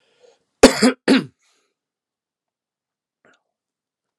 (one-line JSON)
{"cough_length": "4.2 s", "cough_amplitude": 32768, "cough_signal_mean_std_ratio": 0.22, "survey_phase": "alpha (2021-03-01 to 2021-08-12)", "age": "65+", "gender": "Male", "wearing_mask": "No", "symptom_cough_any": true, "symptom_headache": true, "symptom_onset": "4 days", "smoker_status": "Never smoked", "respiratory_condition_asthma": false, "respiratory_condition_other": false, "recruitment_source": "Test and Trace", "submission_delay": "2 days", "covid_test_result": "Positive", "covid_test_method": "RT-qPCR", "covid_ct_value": 22.1, "covid_ct_gene": "N gene", "covid_ct_mean": 22.3, "covid_viral_load": "50000 copies/ml", "covid_viral_load_category": "Low viral load (10K-1M copies/ml)"}